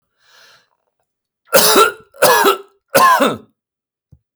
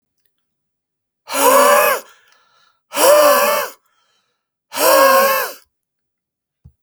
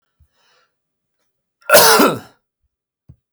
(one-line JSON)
{"three_cough_length": "4.4 s", "three_cough_amplitude": 32768, "three_cough_signal_mean_std_ratio": 0.44, "exhalation_length": "6.8 s", "exhalation_amplitude": 32768, "exhalation_signal_mean_std_ratio": 0.47, "cough_length": "3.3 s", "cough_amplitude": 32768, "cough_signal_mean_std_ratio": 0.3, "survey_phase": "beta (2021-08-13 to 2022-03-07)", "age": "45-64", "gender": "Male", "wearing_mask": "No", "symptom_none": true, "smoker_status": "Never smoked", "respiratory_condition_asthma": false, "respiratory_condition_other": false, "recruitment_source": "REACT", "submission_delay": "3 days", "covid_test_result": "Negative", "covid_test_method": "RT-qPCR"}